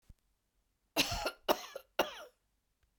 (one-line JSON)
{"cough_length": "3.0 s", "cough_amplitude": 7713, "cough_signal_mean_std_ratio": 0.32, "survey_phase": "beta (2021-08-13 to 2022-03-07)", "age": "65+", "gender": "Female", "wearing_mask": "No", "symptom_none": true, "smoker_status": "Never smoked", "respiratory_condition_asthma": false, "respiratory_condition_other": false, "recruitment_source": "REACT", "submission_delay": "2 days", "covid_test_result": "Negative", "covid_test_method": "RT-qPCR", "influenza_a_test_result": "Negative", "influenza_b_test_result": "Negative"}